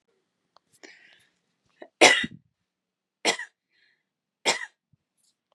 three_cough_length: 5.5 s
three_cough_amplitude: 32115
three_cough_signal_mean_std_ratio: 0.21
survey_phase: beta (2021-08-13 to 2022-03-07)
age: 18-44
gender: Female
wearing_mask: 'No'
symptom_none: true
smoker_status: Never smoked
respiratory_condition_asthma: false
respiratory_condition_other: false
recruitment_source: REACT
submission_delay: 1 day
covid_test_result: Negative
covid_test_method: RT-qPCR
influenza_a_test_result: Negative
influenza_b_test_result: Negative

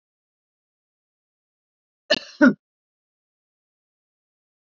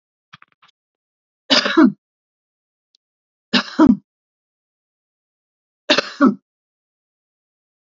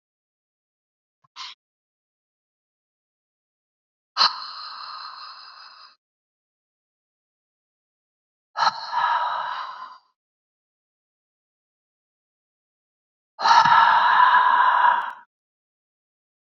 cough_length: 4.8 s
cough_amplitude: 27571
cough_signal_mean_std_ratio: 0.15
three_cough_length: 7.9 s
three_cough_amplitude: 32047
three_cough_signal_mean_std_ratio: 0.26
exhalation_length: 16.5 s
exhalation_amplitude: 25610
exhalation_signal_mean_std_ratio: 0.34
survey_phase: beta (2021-08-13 to 2022-03-07)
age: 65+
gender: Female
wearing_mask: 'No'
symptom_headache: true
smoker_status: Current smoker (1 to 10 cigarettes per day)
respiratory_condition_asthma: true
respiratory_condition_other: false
recruitment_source: REACT
submission_delay: 3 days
covid_test_result: Negative
covid_test_method: RT-qPCR
influenza_a_test_result: Negative
influenza_b_test_result: Negative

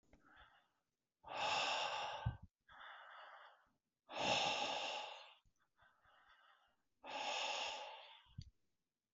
exhalation_length: 9.1 s
exhalation_amplitude: 1884
exhalation_signal_mean_std_ratio: 0.52
survey_phase: beta (2021-08-13 to 2022-03-07)
age: 45-64
gender: Male
wearing_mask: 'No'
symptom_runny_or_blocked_nose: true
symptom_sore_throat: true
symptom_onset: 11 days
smoker_status: Never smoked
respiratory_condition_asthma: false
respiratory_condition_other: false
recruitment_source: REACT
submission_delay: 2 days
covid_test_result: Negative
covid_test_method: RT-qPCR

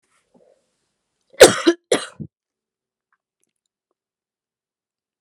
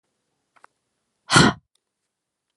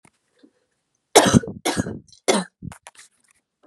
cough_length: 5.2 s
cough_amplitude: 32768
cough_signal_mean_std_ratio: 0.17
exhalation_length: 2.6 s
exhalation_amplitude: 29739
exhalation_signal_mean_std_ratio: 0.23
three_cough_length: 3.7 s
three_cough_amplitude: 32767
three_cough_signal_mean_std_ratio: 0.3
survey_phase: alpha (2021-03-01 to 2021-08-12)
age: 18-44
gender: Female
wearing_mask: 'No'
symptom_cough_any: true
symptom_headache: true
symptom_onset: 4 days
smoker_status: Never smoked
respiratory_condition_asthma: false
respiratory_condition_other: false
recruitment_source: Test and Trace
submission_delay: 2 days
covid_test_result: Positive
covid_test_method: RT-qPCR
covid_ct_value: 16.5
covid_ct_gene: ORF1ab gene
covid_ct_mean: 16.9
covid_viral_load: 2800000 copies/ml
covid_viral_load_category: High viral load (>1M copies/ml)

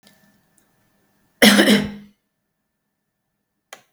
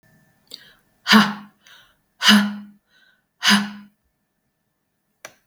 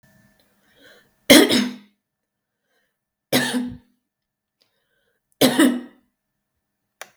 cough_length: 3.9 s
cough_amplitude: 32768
cough_signal_mean_std_ratio: 0.27
exhalation_length: 5.5 s
exhalation_amplitude: 32768
exhalation_signal_mean_std_ratio: 0.3
three_cough_length: 7.2 s
three_cough_amplitude: 32768
three_cough_signal_mean_std_ratio: 0.28
survey_phase: beta (2021-08-13 to 2022-03-07)
age: 45-64
gender: Female
wearing_mask: 'No'
symptom_change_to_sense_of_smell_or_taste: true
smoker_status: Never smoked
respiratory_condition_asthma: false
respiratory_condition_other: false
recruitment_source: REACT
submission_delay: 2 days
covid_test_result: Negative
covid_test_method: RT-qPCR
influenza_a_test_result: Negative
influenza_b_test_result: Negative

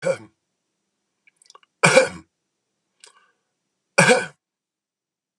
cough_length: 5.4 s
cough_amplitude: 31999
cough_signal_mean_std_ratio: 0.26
survey_phase: beta (2021-08-13 to 2022-03-07)
age: 65+
gender: Male
wearing_mask: 'No'
symptom_none: true
smoker_status: Never smoked
respiratory_condition_asthma: false
respiratory_condition_other: false
recruitment_source: REACT
submission_delay: 3 days
covid_test_result: Negative
covid_test_method: RT-qPCR
influenza_a_test_result: Negative
influenza_b_test_result: Negative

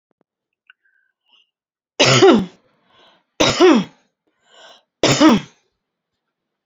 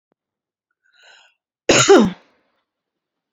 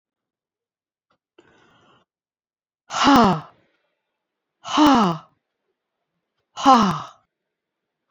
three_cough_length: 6.7 s
three_cough_amplitude: 32699
three_cough_signal_mean_std_ratio: 0.36
cough_length: 3.3 s
cough_amplitude: 30909
cough_signal_mean_std_ratio: 0.28
exhalation_length: 8.1 s
exhalation_amplitude: 30681
exhalation_signal_mean_std_ratio: 0.31
survey_phase: alpha (2021-03-01 to 2021-08-12)
age: 45-64
gender: Female
wearing_mask: 'No'
symptom_none: true
smoker_status: Ex-smoker
respiratory_condition_asthma: false
respiratory_condition_other: false
recruitment_source: REACT
submission_delay: 2 days
covid_test_result: Negative
covid_test_method: RT-qPCR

